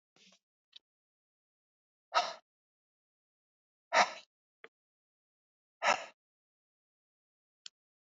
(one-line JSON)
{"exhalation_length": "8.2 s", "exhalation_amplitude": 7645, "exhalation_signal_mean_std_ratio": 0.18, "survey_phase": "beta (2021-08-13 to 2022-03-07)", "age": "45-64", "gender": "Female", "wearing_mask": "No", "symptom_sore_throat": true, "symptom_abdominal_pain": true, "symptom_fatigue": true, "symptom_headache": true, "symptom_onset": "5 days", "smoker_status": "Ex-smoker", "respiratory_condition_asthma": true, "respiratory_condition_other": false, "recruitment_source": "Test and Trace", "submission_delay": "1 day", "covid_test_result": "Negative", "covid_test_method": "RT-qPCR"}